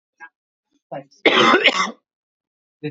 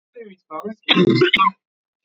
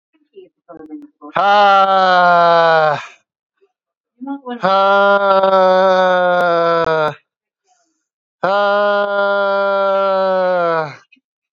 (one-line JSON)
{"cough_length": "2.9 s", "cough_amplitude": 29691, "cough_signal_mean_std_ratio": 0.38, "three_cough_length": "2.0 s", "three_cough_amplitude": 29892, "three_cough_signal_mean_std_ratio": 0.48, "exhalation_length": "11.5 s", "exhalation_amplitude": 30412, "exhalation_signal_mean_std_ratio": 0.71, "survey_phase": "beta (2021-08-13 to 2022-03-07)", "age": "18-44", "gender": "Male", "wearing_mask": "No", "symptom_none": true, "smoker_status": "Never smoked", "respiratory_condition_asthma": true, "respiratory_condition_other": false, "recruitment_source": "REACT", "submission_delay": "3 days", "covid_test_result": "Negative", "covid_test_method": "RT-qPCR", "influenza_a_test_result": "Negative", "influenza_b_test_result": "Negative"}